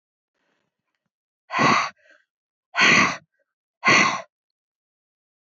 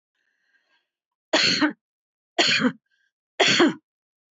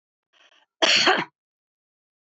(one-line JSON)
{"exhalation_length": "5.5 s", "exhalation_amplitude": 21300, "exhalation_signal_mean_std_ratio": 0.35, "three_cough_length": "4.4 s", "three_cough_amplitude": 20598, "three_cough_signal_mean_std_ratio": 0.4, "cough_length": "2.2 s", "cough_amplitude": 24507, "cough_signal_mean_std_ratio": 0.34, "survey_phase": "beta (2021-08-13 to 2022-03-07)", "age": "65+", "gender": "Female", "wearing_mask": "No", "symptom_none": true, "smoker_status": "Never smoked", "respiratory_condition_asthma": false, "respiratory_condition_other": false, "recruitment_source": "REACT", "submission_delay": "2 days", "covid_test_result": "Negative", "covid_test_method": "RT-qPCR"}